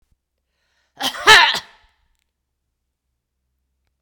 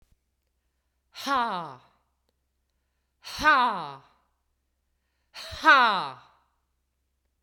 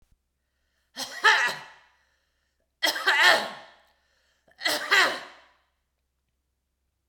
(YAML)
cough_length: 4.0 s
cough_amplitude: 32768
cough_signal_mean_std_ratio: 0.23
exhalation_length: 7.4 s
exhalation_amplitude: 17165
exhalation_signal_mean_std_ratio: 0.31
three_cough_length: 7.1 s
three_cough_amplitude: 22839
three_cough_signal_mean_std_ratio: 0.35
survey_phase: beta (2021-08-13 to 2022-03-07)
age: 45-64
gender: Female
wearing_mask: 'No'
symptom_none: true
smoker_status: Never smoked
respiratory_condition_asthma: false
respiratory_condition_other: false
recruitment_source: REACT
submission_delay: 1 day
covid_test_result: Negative
covid_test_method: RT-qPCR